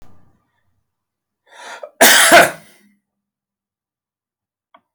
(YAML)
cough_length: 4.9 s
cough_amplitude: 32768
cough_signal_mean_std_ratio: 0.27
survey_phase: alpha (2021-03-01 to 2021-08-12)
age: 65+
gender: Male
wearing_mask: 'No'
symptom_none: true
smoker_status: Ex-smoker
respiratory_condition_asthma: false
respiratory_condition_other: false
recruitment_source: REACT
submission_delay: 1 day
covid_test_result: Negative
covid_test_method: RT-qPCR